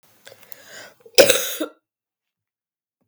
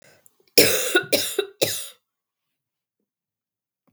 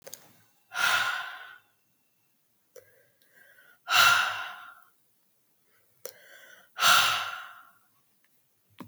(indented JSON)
{
  "cough_length": "3.1 s",
  "cough_amplitude": 32767,
  "cough_signal_mean_std_ratio": 0.25,
  "three_cough_length": "3.9 s",
  "three_cough_amplitude": 32768,
  "three_cough_signal_mean_std_ratio": 0.34,
  "exhalation_length": "8.9 s",
  "exhalation_amplitude": 13912,
  "exhalation_signal_mean_std_ratio": 0.35,
  "survey_phase": "beta (2021-08-13 to 2022-03-07)",
  "age": "18-44",
  "gender": "Female",
  "wearing_mask": "No",
  "symptom_cough_any": true,
  "symptom_new_continuous_cough": true,
  "symptom_runny_or_blocked_nose": true,
  "symptom_sore_throat": true,
  "smoker_status": "Never smoked",
  "respiratory_condition_asthma": false,
  "respiratory_condition_other": false,
  "recruitment_source": "Test and Trace",
  "submission_delay": "2 days",
  "covid_test_result": "Positive",
  "covid_test_method": "RT-qPCR"
}